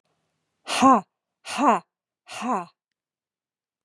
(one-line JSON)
{"exhalation_length": "3.8 s", "exhalation_amplitude": 23342, "exhalation_signal_mean_std_ratio": 0.32, "survey_phase": "beta (2021-08-13 to 2022-03-07)", "age": "45-64", "gender": "Female", "wearing_mask": "No", "symptom_none": true, "smoker_status": "Never smoked", "respiratory_condition_asthma": false, "respiratory_condition_other": false, "recruitment_source": "REACT", "submission_delay": "2 days", "covid_test_result": "Negative", "covid_test_method": "RT-qPCR", "influenza_a_test_result": "Negative", "influenza_b_test_result": "Negative"}